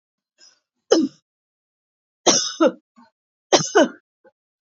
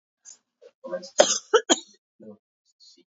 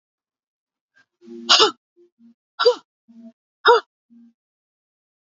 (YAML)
three_cough_length: 4.7 s
three_cough_amplitude: 28413
three_cough_signal_mean_std_ratio: 0.32
cough_length: 3.1 s
cough_amplitude: 28769
cough_signal_mean_std_ratio: 0.26
exhalation_length: 5.4 s
exhalation_amplitude: 31628
exhalation_signal_mean_std_ratio: 0.25
survey_phase: beta (2021-08-13 to 2022-03-07)
age: 45-64
gender: Female
wearing_mask: 'No'
symptom_cough_any: true
symptom_onset: 8 days
smoker_status: Never smoked
respiratory_condition_asthma: false
respiratory_condition_other: false
recruitment_source: REACT
submission_delay: 2 days
covid_test_result: Negative
covid_test_method: RT-qPCR
influenza_a_test_result: Negative
influenza_b_test_result: Negative